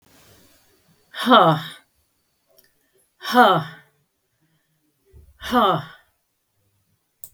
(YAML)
exhalation_length: 7.3 s
exhalation_amplitude: 32768
exhalation_signal_mean_std_ratio: 0.31
survey_phase: beta (2021-08-13 to 2022-03-07)
age: 65+
gender: Female
wearing_mask: 'No'
symptom_none: true
smoker_status: Never smoked
respiratory_condition_asthma: false
respiratory_condition_other: false
recruitment_source: REACT
submission_delay: 0 days
covid_test_result: Negative
covid_test_method: RT-qPCR